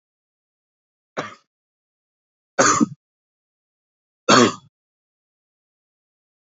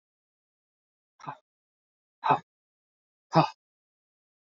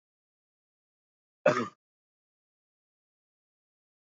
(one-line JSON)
{"three_cough_length": "6.5 s", "three_cough_amplitude": 27957, "three_cough_signal_mean_std_ratio": 0.22, "exhalation_length": "4.4 s", "exhalation_amplitude": 16613, "exhalation_signal_mean_std_ratio": 0.19, "cough_length": "4.1 s", "cough_amplitude": 8580, "cough_signal_mean_std_ratio": 0.15, "survey_phase": "beta (2021-08-13 to 2022-03-07)", "age": "18-44", "gender": "Male", "wearing_mask": "No", "symptom_cough_any": true, "symptom_runny_or_blocked_nose": true, "symptom_sore_throat": true, "symptom_other": true, "symptom_onset": "4 days", "smoker_status": "Never smoked", "respiratory_condition_asthma": false, "respiratory_condition_other": false, "recruitment_source": "Test and Trace", "submission_delay": "2 days", "covid_test_result": "Positive", "covid_test_method": "RT-qPCR", "covid_ct_value": 14.0, "covid_ct_gene": "ORF1ab gene", "covid_ct_mean": 14.2, "covid_viral_load": "22000000 copies/ml", "covid_viral_load_category": "High viral load (>1M copies/ml)"}